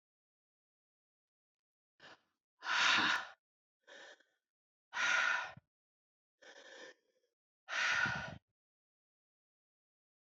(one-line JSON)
{"exhalation_length": "10.2 s", "exhalation_amplitude": 4185, "exhalation_signal_mean_std_ratio": 0.34, "survey_phase": "beta (2021-08-13 to 2022-03-07)", "age": "45-64", "gender": "Female", "wearing_mask": "No", "symptom_cough_any": true, "symptom_new_continuous_cough": true, "symptom_runny_or_blocked_nose": true, "symptom_shortness_of_breath": true, "symptom_sore_throat": true, "symptom_fatigue": true, "symptom_fever_high_temperature": true, "symptom_headache": true, "symptom_change_to_sense_of_smell_or_taste": true, "symptom_loss_of_taste": true, "smoker_status": "Ex-smoker", "respiratory_condition_asthma": false, "respiratory_condition_other": false, "recruitment_source": "Test and Trace", "submission_delay": "1 day", "covid_test_result": "Positive", "covid_test_method": "RT-qPCR", "covid_ct_value": 16.5, "covid_ct_gene": "N gene"}